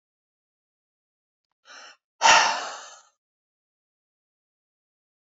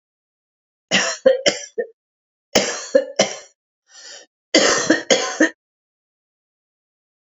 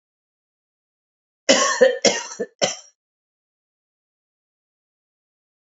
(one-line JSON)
{"exhalation_length": "5.4 s", "exhalation_amplitude": 26714, "exhalation_signal_mean_std_ratio": 0.22, "three_cough_length": "7.3 s", "three_cough_amplitude": 32545, "three_cough_signal_mean_std_ratio": 0.38, "cough_length": "5.7 s", "cough_amplitude": 28238, "cough_signal_mean_std_ratio": 0.27, "survey_phase": "beta (2021-08-13 to 2022-03-07)", "age": "45-64", "gender": "Female", "wearing_mask": "No", "symptom_cough_any": true, "symptom_runny_or_blocked_nose": true, "symptom_shortness_of_breath": true, "symptom_sore_throat": true, "symptom_headache": true, "symptom_onset": "3 days", "smoker_status": "Never smoked", "respiratory_condition_asthma": true, "respiratory_condition_other": false, "recruitment_source": "Test and Trace", "submission_delay": "1 day", "covid_test_result": "Positive", "covid_test_method": "RT-qPCR", "covid_ct_value": 21.7, "covid_ct_gene": "ORF1ab gene", "covid_ct_mean": 22.2, "covid_viral_load": "51000 copies/ml", "covid_viral_load_category": "Low viral load (10K-1M copies/ml)"}